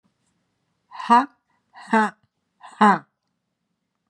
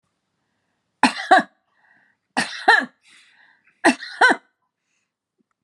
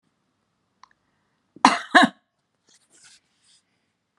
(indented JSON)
{
  "exhalation_length": "4.1 s",
  "exhalation_amplitude": 25075,
  "exhalation_signal_mean_std_ratio": 0.28,
  "three_cough_length": "5.6 s",
  "three_cough_amplitude": 29242,
  "three_cough_signal_mean_std_ratio": 0.29,
  "cough_length": "4.2 s",
  "cough_amplitude": 32768,
  "cough_signal_mean_std_ratio": 0.19,
  "survey_phase": "beta (2021-08-13 to 2022-03-07)",
  "age": "65+",
  "gender": "Female",
  "wearing_mask": "No",
  "symptom_none": true,
  "smoker_status": "Ex-smoker",
  "respiratory_condition_asthma": false,
  "respiratory_condition_other": false,
  "recruitment_source": "REACT",
  "submission_delay": "5 days",
  "covid_test_result": "Negative",
  "covid_test_method": "RT-qPCR",
  "influenza_a_test_result": "Negative",
  "influenza_b_test_result": "Negative"
}